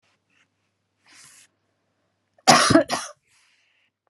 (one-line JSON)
{"cough_length": "4.1 s", "cough_amplitude": 32191, "cough_signal_mean_std_ratio": 0.25, "survey_phase": "beta (2021-08-13 to 2022-03-07)", "age": "45-64", "gender": "Female", "wearing_mask": "No", "symptom_none": true, "smoker_status": "Never smoked", "respiratory_condition_asthma": false, "respiratory_condition_other": false, "recruitment_source": "REACT", "submission_delay": "1 day", "covid_test_result": "Negative", "covid_test_method": "RT-qPCR", "influenza_a_test_result": "Negative", "influenza_b_test_result": "Negative"}